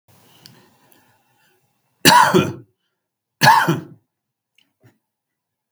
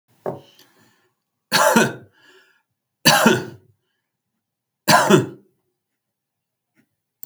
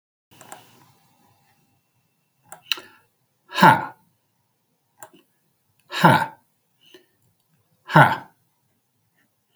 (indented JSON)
{
  "cough_length": "5.7 s",
  "cough_amplitude": 32768,
  "cough_signal_mean_std_ratio": 0.3,
  "three_cough_length": "7.3 s",
  "three_cough_amplitude": 32768,
  "three_cough_signal_mean_std_ratio": 0.32,
  "exhalation_length": "9.6 s",
  "exhalation_amplitude": 32768,
  "exhalation_signal_mean_std_ratio": 0.22,
  "survey_phase": "beta (2021-08-13 to 2022-03-07)",
  "age": "45-64",
  "gender": "Male",
  "wearing_mask": "No",
  "symptom_none": true,
  "smoker_status": "Ex-smoker",
  "respiratory_condition_asthma": false,
  "respiratory_condition_other": false,
  "recruitment_source": "REACT",
  "submission_delay": "3 days",
  "covid_test_result": "Negative",
  "covid_test_method": "RT-qPCR",
  "influenza_a_test_result": "Negative",
  "influenza_b_test_result": "Negative"
}